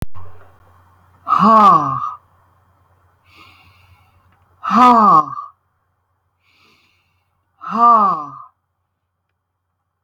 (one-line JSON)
{"exhalation_length": "10.0 s", "exhalation_amplitude": 30673, "exhalation_signal_mean_std_ratio": 0.39, "survey_phase": "alpha (2021-03-01 to 2021-08-12)", "age": "65+", "gender": "Female", "wearing_mask": "No", "symptom_none": true, "smoker_status": "Ex-smoker", "respiratory_condition_asthma": false, "respiratory_condition_other": false, "recruitment_source": "REACT", "submission_delay": "2 days", "covid_test_result": "Negative", "covid_test_method": "RT-qPCR"}